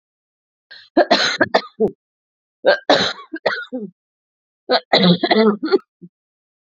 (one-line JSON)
{"three_cough_length": "6.7 s", "three_cough_amplitude": 32767, "three_cough_signal_mean_std_ratio": 0.43, "survey_phase": "beta (2021-08-13 to 2022-03-07)", "age": "45-64", "gender": "Female", "wearing_mask": "No", "symptom_cough_any": true, "symptom_runny_or_blocked_nose": true, "symptom_sore_throat": true, "symptom_abdominal_pain": true, "symptom_fatigue": true, "symptom_fever_high_temperature": true, "symptom_headache": true, "symptom_onset": "3 days", "smoker_status": "Ex-smoker", "respiratory_condition_asthma": false, "respiratory_condition_other": false, "recruitment_source": "Test and Trace", "submission_delay": "1 day", "covid_test_result": "Positive", "covid_test_method": "ePCR"}